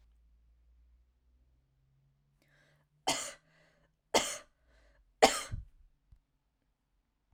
three_cough_length: 7.3 s
three_cough_amplitude: 13222
three_cough_signal_mean_std_ratio: 0.2
survey_phase: alpha (2021-03-01 to 2021-08-12)
age: 18-44
gender: Female
wearing_mask: 'No'
symptom_diarrhoea: true
smoker_status: Never smoked
respiratory_condition_asthma: false
respiratory_condition_other: false
recruitment_source: REACT
submission_delay: 1 day
covid_test_result: Negative
covid_test_method: RT-qPCR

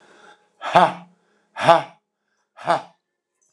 exhalation_length: 3.5 s
exhalation_amplitude: 29204
exhalation_signal_mean_std_ratio: 0.28
survey_phase: beta (2021-08-13 to 2022-03-07)
age: 65+
gender: Male
wearing_mask: 'No'
symptom_none: true
smoker_status: Ex-smoker
respiratory_condition_asthma: false
respiratory_condition_other: false
recruitment_source: REACT
submission_delay: 0 days
covid_test_result: Negative
covid_test_method: RT-qPCR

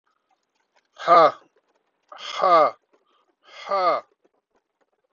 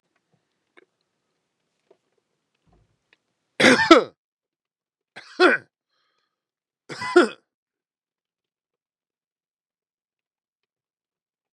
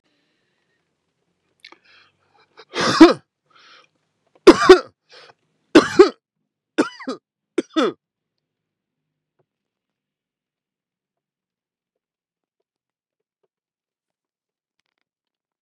exhalation_length: 5.1 s
exhalation_amplitude: 22722
exhalation_signal_mean_std_ratio: 0.33
three_cough_length: 11.5 s
three_cough_amplitude: 32768
three_cough_signal_mean_std_ratio: 0.19
cough_length: 15.6 s
cough_amplitude: 32768
cough_signal_mean_std_ratio: 0.18
survey_phase: beta (2021-08-13 to 2022-03-07)
age: 45-64
gender: Male
wearing_mask: 'No'
symptom_none: true
symptom_onset: 12 days
smoker_status: Current smoker (1 to 10 cigarettes per day)
recruitment_source: REACT
submission_delay: 3 days
covid_test_result: Negative
covid_test_method: RT-qPCR
influenza_a_test_result: Negative
influenza_b_test_result: Negative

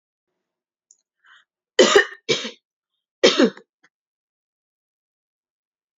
three_cough_length: 6.0 s
three_cough_amplitude: 27889
three_cough_signal_mean_std_ratio: 0.24
survey_phase: beta (2021-08-13 to 2022-03-07)
age: 18-44
gender: Female
wearing_mask: 'No'
symptom_none: true
smoker_status: Never smoked
respiratory_condition_asthma: false
respiratory_condition_other: false
recruitment_source: REACT
submission_delay: 2 days
covid_test_result: Negative
covid_test_method: RT-qPCR
influenza_a_test_result: Negative
influenza_b_test_result: Negative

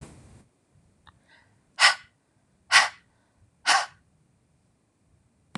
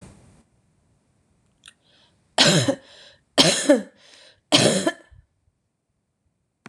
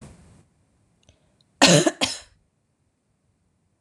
exhalation_length: 5.6 s
exhalation_amplitude: 23238
exhalation_signal_mean_std_ratio: 0.24
three_cough_length: 6.7 s
three_cough_amplitude: 26027
three_cough_signal_mean_std_ratio: 0.32
cough_length: 3.8 s
cough_amplitude: 26028
cough_signal_mean_std_ratio: 0.24
survey_phase: beta (2021-08-13 to 2022-03-07)
age: 18-44
gender: Female
wearing_mask: 'No'
symptom_shortness_of_breath: true
symptom_sore_throat: true
symptom_onset: 12 days
smoker_status: Ex-smoker
respiratory_condition_asthma: false
respiratory_condition_other: false
recruitment_source: REACT
submission_delay: 3 days
covid_test_result: Negative
covid_test_method: RT-qPCR
influenza_a_test_result: Negative
influenza_b_test_result: Negative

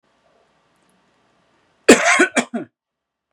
cough_length: 3.3 s
cough_amplitude: 32768
cough_signal_mean_std_ratio: 0.28
survey_phase: beta (2021-08-13 to 2022-03-07)
age: 18-44
gender: Male
wearing_mask: 'No'
symptom_runny_or_blocked_nose: true
symptom_fatigue: true
symptom_onset: 5 days
smoker_status: Current smoker (11 or more cigarettes per day)
respiratory_condition_asthma: true
respiratory_condition_other: false
recruitment_source: REACT
submission_delay: 2 days
covid_test_result: Negative
covid_test_method: RT-qPCR
influenza_a_test_result: Negative
influenza_b_test_result: Negative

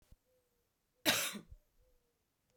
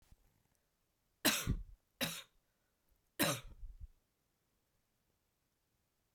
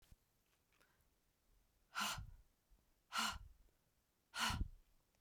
cough_length: 2.6 s
cough_amplitude: 5143
cough_signal_mean_std_ratio: 0.27
three_cough_length: 6.1 s
three_cough_amplitude: 3970
three_cough_signal_mean_std_ratio: 0.29
exhalation_length: 5.2 s
exhalation_amplitude: 1425
exhalation_signal_mean_std_ratio: 0.37
survey_phase: alpha (2021-03-01 to 2021-08-12)
age: 45-64
gender: Female
wearing_mask: 'No'
symptom_cough_any: true
symptom_fatigue: true
symptom_headache: true
symptom_onset: 3 days
smoker_status: Ex-smoker
respiratory_condition_asthma: false
respiratory_condition_other: false
recruitment_source: Test and Trace
submission_delay: 1 day
covid_test_result: Positive
covid_test_method: RT-qPCR
covid_ct_value: 15.3
covid_ct_gene: ORF1ab gene
covid_ct_mean: 16.7
covid_viral_load: 3300000 copies/ml
covid_viral_load_category: High viral load (>1M copies/ml)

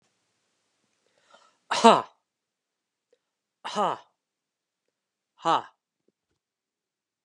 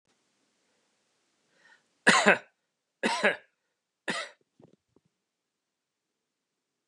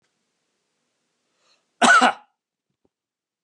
exhalation_length: 7.2 s
exhalation_amplitude: 29727
exhalation_signal_mean_std_ratio: 0.18
three_cough_length: 6.9 s
three_cough_amplitude: 21430
three_cough_signal_mean_std_ratio: 0.23
cough_length: 3.4 s
cough_amplitude: 30660
cough_signal_mean_std_ratio: 0.24
survey_phase: beta (2021-08-13 to 2022-03-07)
age: 45-64
gender: Male
wearing_mask: 'No'
symptom_cough_any: true
symptom_runny_or_blocked_nose: true
symptom_shortness_of_breath: true
symptom_fatigue: true
symptom_headache: true
symptom_loss_of_taste: true
symptom_onset: 4 days
smoker_status: Ex-smoker
respiratory_condition_asthma: true
respiratory_condition_other: false
recruitment_source: Test and Trace
submission_delay: 1 day
covid_test_result: Positive
covid_test_method: RT-qPCR
covid_ct_value: 18.9
covid_ct_gene: ORF1ab gene
covid_ct_mean: 19.4
covid_viral_load: 430000 copies/ml
covid_viral_load_category: Low viral load (10K-1M copies/ml)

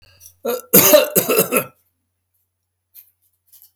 cough_length: 3.8 s
cough_amplitude: 32768
cough_signal_mean_std_ratio: 0.37
survey_phase: beta (2021-08-13 to 2022-03-07)
age: 65+
gender: Male
wearing_mask: 'No'
symptom_none: true
smoker_status: Ex-smoker
respiratory_condition_asthma: false
respiratory_condition_other: false
recruitment_source: REACT
submission_delay: 1 day
covid_test_result: Negative
covid_test_method: RT-qPCR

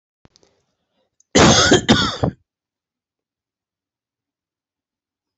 cough_length: 5.4 s
cough_amplitude: 29484
cough_signal_mean_std_ratio: 0.3
survey_phase: alpha (2021-03-01 to 2021-08-12)
age: 65+
gender: Male
wearing_mask: 'No'
symptom_headache: true
symptom_change_to_sense_of_smell_or_taste: true
symptom_loss_of_taste: true
smoker_status: Never smoked
respiratory_condition_asthma: false
respiratory_condition_other: false
recruitment_source: Test and Trace
submission_delay: 2 days
covid_test_result: Positive
covid_test_method: RT-qPCR
covid_ct_value: 21.5
covid_ct_gene: ORF1ab gene
covid_ct_mean: 22.1
covid_viral_load: 56000 copies/ml
covid_viral_load_category: Low viral load (10K-1M copies/ml)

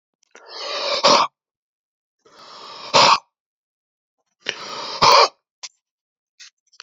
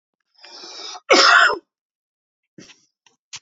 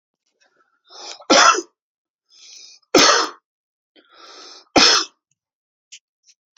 exhalation_length: 6.8 s
exhalation_amplitude: 32768
exhalation_signal_mean_std_ratio: 0.34
cough_length: 3.4 s
cough_amplitude: 32767
cough_signal_mean_std_ratio: 0.33
three_cough_length: 6.6 s
three_cough_amplitude: 32768
three_cough_signal_mean_std_ratio: 0.31
survey_phase: beta (2021-08-13 to 2022-03-07)
age: 45-64
gender: Male
wearing_mask: 'No'
symptom_none: true
smoker_status: Never smoked
respiratory_condition_asthma: false
respiratory_condition_other: false
recruitment_source: REACT
submission_delay: 1 day
covid_test_result: Negative
covid_test_method: RT-qPCR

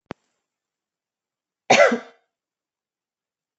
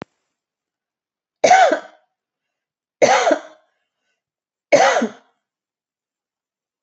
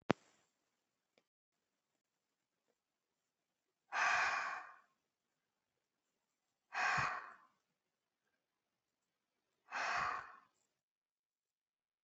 cough_length: 3.6 s
cough_amplitude: 26192
cough_signal_mean_std_ratio: 0.21
three_cough_length: 6.8 s
three_cough_amplitude: 28055
three_cough_signal_mean_std_ratio: 0.31
exhalation_length: 12.0 s
exhalation_amplitude: 8051
exhalation_signal_mean_std_ratio: 0.29
survey_phase: beta (2021-08-13 to 2022-03-07)
age: 45-64
gender: Female
wearing_mask: 'No'
symptom_none: true
smoker_status: Never smoked
respiratory_condition_asthma: false
respiratory_condition_other: false
recruitment_source: REACT
submission_delay: 3 days
covid_test_result: Negative
covid_test_method: RT-qPCR
influenza_a_test_result: Negative
influenza_b_test_result: Negative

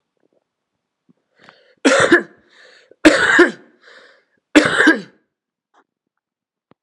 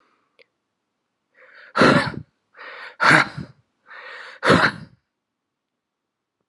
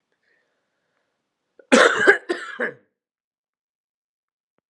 three_cough_length: 6.8 s
three_cough_amplitude: 32768
three_cough_signal_mean_std_ratio: 0.33
exhalation_length: 6.5 s
exhalation_amplitude: 28979
exhalation_signal_mean_std_ratio: 0.32
cough_length: 4.7 s
cough_amplitude: 32747
cough_signal_mean_std_ratio: 0.26
survey_phase: alpha (2021-03-01 to 2021-08-12)
age: 18-44
gender: Male
wearing_mask: 'No'
symptom_shortness_of_breath: true
symptom_change_to_sense_of_smell_or_taste: true
symptom_loss_of_taste: true
symptom_onset: 4 days
smoker_status: Current smoker (1 to 10 cigarettes per day)
respiratory_condition_asthma: false
respiratory_condition_other: false
recruitment_source: Test and Trace
submission_delay: 2 days
covid_test_result: Positive
covid_test_method: RT-qPCR
covid_ct_value: 22.6
covid_ct_gene: ORF1ab gene
covid_ct_mean: 24.3
covid_viral_load: 11000 copies/ml
covid_viral_load_category: Low viral load (10K-1M copies/ml)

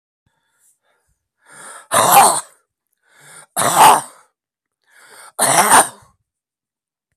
exhalation_length: 7.2 s
exhalation_amplitude: 32768
exhalation_signal_mean_std_ratio: 0.35
survey_phase: beta (2021-08-13 to 2022-03-07)
age: 65+
gender: Male
wearing_mask: 'No'
symptom_new_continuous_cough: true
symptom_runny_or_blocked_nose: true
symptom_shortness_of_breath: true
symptom_sore_throat: true
symptom_fatigue: true
symptom_fever_high_temperature: true
symptom_headache: true
symptom_change_to_sense_of_smell_or_taste: true
symptom_loss_of_taste: true
symptom_onset: 4 days
smoker_status: Never smoked
respiratory_condition_asthma: false
respiratory_condition_other: false
recruitment_source: Test and Trace
submission_delay: 2 days
covid_test_result: Positive
covid_test_method: RT-qPCR
covid_ct_value: 15.8
covid_ct_gene: N gene
covid_ct_mean: 16.9
covid_viral_load: 2800000 copies/ml
covid_viral_load_category: High viral load (>1M copies/ml)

